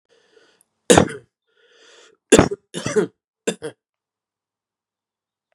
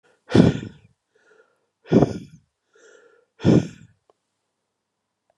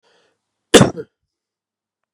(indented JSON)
{
  "three_cough_length": "5.5 s",
  "three_cough_amplitude": 32768,
  "three_cough_signal_mean_std_ratio": 0.23,
  "exhalation_length": "5.4 s",
  "exhalation_amplitude": 31487,
  "exhalation_signal_mean_std_ratio": 0.27,
  "cough_length": "2.1 s",
  "cough_amplitude": 32768,
  "cough_signal_mean_std_ratio": 0.21,
  "survey_phase": "beta (2021-08-13 to 2022-03-07)",
  "age": "45-64",
  "gender": "Male",
  "wearing_mask": "No",
  "symptom_runny_or_blocked_nose": true,
  "smoker_status": "Never smoked",
  "respiratory_condition_asthma": false,
  "respiratory_condition_other": false,
  "recruitment_source": "Test and Trace",
  "submission_delay": "2 days",
  "covid_test_result": "Positive",
  "covid_test_method": "RT-qPCR",
  "covid_ct_value": 13.1,
  "covid_ct_gene": "ORF1ab gene",
  "covid_ct_mean": 13.6,
  "covid_viral_load": "34000000 copies/ml",
  "covid_viral_load_category": "High viral load (>1M copies/ml)"
}